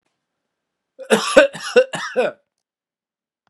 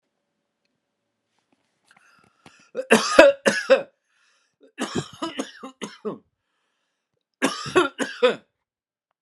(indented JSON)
{
  "cough_length": "3.5 s",
  "cough_amplitude": 32768,
  "cough_signal_mean_std_ratio": 0.33,
  "three_cough_length": "9.2 s",
  "three_cough_amplitude": 32768,
  "three_cough_signal_mean_std_ratio": 0.29,
  "survey_phase": "beta (2021-08-13 to 2022-03-07)",
  "age": "45-64",
  "gender": "Male",
  "wearing_mask": "No",
  "symptom_none": true,
  "symptom_onset": "12 days",
  "smoker_status": "Ex-smoker",
  "respiratory_condition_asthma": false,
  "respiratory_condition_other": false,
  "recruitment_source": "REACT",
  "submission_delay": "1 day",
  "covid_test_result": "Negative",
  "covid_test_method": "RT-qPCR"
}